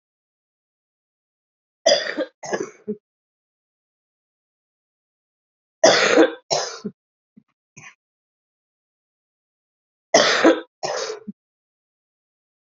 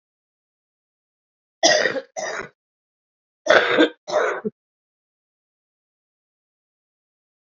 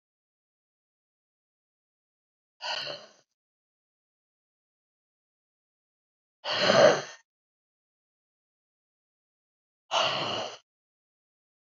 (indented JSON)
{
  "three_cough_length": "12.6 s",
  "three_cough_amplitude": 31192,
  "three_cough_signal_mean_std_ratio": 0.28,
  "cough_length": "7.6 s",
  "cough_amplitude": 30807,
  "cough_signal_mean_std_ratio": 0.3,
  "exhalation_length": "11.7 s",
  "exhalation_amplitude": 18252,
  "exhalation_signal_mean_std_ratio": 0.23,
  "survey_phase": "beta (2021-08-13 to 2022-03-07)",
  "age": "65+",
  "gender": "Female",
  "wearing_mask": "No",
  "symptom_cough_any": true,
  "symptom_new_continuous_cough": true,
  "symptom_runny_or_blocked_nose": true,
  "symptom_fatigue": true,
  "symptom_change_to_sense_of_smell_or_taste": true,
  "symptom_onset": "5 days",
  "smoker_status": "Ex-smoker",
  "respiratory_condition_asthma": false,
  "respiratory_condition_other": true,
  "recruitment_source": "Test and Trace",
  "submission_delay": "1 day",
  "covid_test_result": "Positive",
  "covid_test_method": "RT-qPCR",
  "covid_ct_value": 26.1,
  "covid_ct_gene": "ORF1ab gene",
  "covid_ct_mean": 26.8,
  "covid_viral_load": "1600 copies/ml",
  "covid_viral_load_category": "Minimal viral load (< 10K copies/ml)"
}